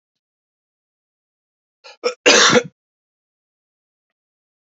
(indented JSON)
{
  "cough_length": "4.7 s",
  "cough_amplitude": 32768,
  "cough_signal_mean_std_ratio": 0.24,
  "survey_phase": "beta (2021-08-13 to 2022-03-07)",
  "age": "18-44",
  "gender": "Male",
  "wearing_mask": "No",
  "symptom_cough_any": true,
  "symptom_runny_or_blocked_nose": true,
  "symptom_fatigue": true,
  "symptom_fever_high_temperature": true,
  "symptom_headache": true,
  "symptom_other": true,
  "smoker_status": "Never smoked",
  "respiratory_condition_asthma": false,
  "respiratory_condition_other": false,
  "recruitment_source": "Test and Trace",
  "submission_delay": "1 day",
  "covid_test_result": "Positive",
  "covid_test_method": "LAMP"
}